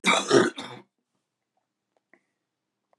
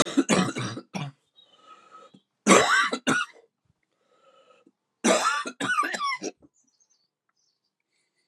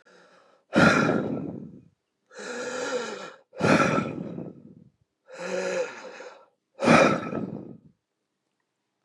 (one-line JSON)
{"cough_length": "3.0 s", "cough_amplitude": 17879, "cough_signal_mean_std_ratio": 0.3, "three_cough_length": "8.3 s", "three_cough_amplitude": 27166, "three_cough_signal_mean_std_ratio": 0.41, "exhalation_length": "9.0 s", "exhalation_amplitude": 21290, "exhalation_signal_mean_std_ratio": 0.46, "survey_phase": "beta (2021-08-13 to 2022-03-07)", "age": "45-64", "gender": "Male", "wearing_mask": "No", "symptom_shortness_of_breath": true, "symptom_sore_throat": true, "symptom_abdominal_pain": true, "symptom_diarrhoea": true, "symptom_fatigue": true, "symptom_fever_high_temperature": true, "symptom_headache": true, "symptom_other": true, "symptom_onset": "2 days", "smoker_status": "Never smoked", "respiratory_condition_asthma": true, "respiratory_condition_other": false, "recruitment_source": "Test and Trace", "submission_delay": "1 day", "covid_test_result": "Positive", "covid_test_method": "LAMP"}